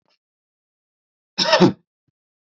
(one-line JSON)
{"cough_length": "2.6 s", "cough_amplitude": 28196, "cough_signal_mean_std_ratio": 0.26, "survey_phase": "beta (2021-08-13 to 2022-03-07)", "age": "18-44", "gender": "Male", "wearing_mask": "No", "symptom_runny_or_blocked_nose": true, "smoker_status": "Never smoked", "respiratory_condition_asthma": false, "respiratory_condition_other": false, "recruitment_source": "Test and Trace", "submission_delay": "2 days", "covid_test_result": "Positive", "covid_test_method": "RT-qPCR", "covid_ct_value": 23.5, "covid_ct_gene": "ORF1ab gene"}